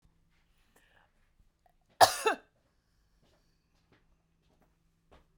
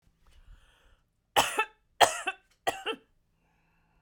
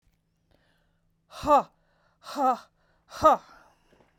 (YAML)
cough_length: 5.4 s
cough_amplitude: 16928
cough_signal_mean_std_ratio: 0.15
three_cough_length: 4.0 s
three_cough_amplitude: 23063
three_cough_signal_mean_std_ratio: 0.27
exhalation_length: 4.2 s
exhalation_amplitude: 15980
exhalation_signal_mean_std_ratio: 0.29
survey_phase: beta (2021-08-13 to 2022-03-07)
age: 65+
gender: Female
wearing_mask: 'No'
symptom_cough_any: true
symptom_headache: true
symptom_onset: 9 days
smoker_status: Ex-smoker
respiratory_condition_asthma: false
respiratory_condition_other: false
recruitment_source: Test and Trace
submission_delay: 3 days
covid_test_result: Negative
covid_test_method: RT-qPCR